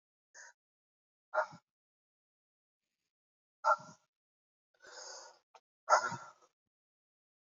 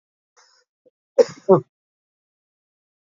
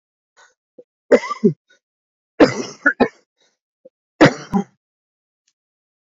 exhalation_length: 7.6 s
exhalation_amplitude: 8235
exhalation_signal_mean_std_ratio: 0.21
cough_length: 3.1 s
cough_amplitude: 26906
cough_signal_mean_std_ratio: 0.18
three_cough_length: 6.1 s
three_cough_amplitude: 28921
three_cough_signal_mean_std_ratio: 0.26
survey_phase: beta (2021-08-13 to 2022-03-07)
age: 45-64
gender: Male
wearing_mask: 'No'
symptom_cough_any: true
symptom_new_continuous_cough: true
symptom_runny_or_blocked_nose: true
symptom_shortness_of_breath: true
symptom_fatigue: true
symptom_onset: 3 days
smoker_status: Current smoker (11 or more cigarettes per day)
respiratory_condition_asthma: false
respiratory_condition_other: false
recruitment_source: Test and Trace
submission_delay: 2 days
covid_test_result: Positive
covid_test_method: RT-qPCR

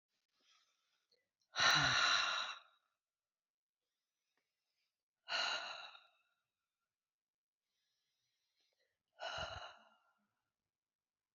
exhalation_length: 11.3 s
exhalation_amplitude: 3306
exhalation_signal_mean_std_ratio: 0.3
survey_phase: beta (2021-08-13 to 2022-03-07)
age: 45-64
gender: Female
wearing_mask: 'No'
symptom_cough_any: true
symptom_new_continuous_cough: true
symptom_runny_or_blocked_nose: true
symptom_shortness_of_breath: true
symptom_sore_throat: true
symptom_fatigue: true
symptom_change_to_sense_of_smell_or_taste: true
symptom_loss_of_taste: true
symptom_onset: 4 days
smoker_status: Never smoked
respiratory_condition_asthma: false
respiratory_condition_other: false
recruitment_source: Test and Trace
submission_delay: 2 days
covid_test_result: Positive
covid_test_method: RT-qPCR
covid_ct_value: 23.2
covid_ct_gene: ORF1ab gene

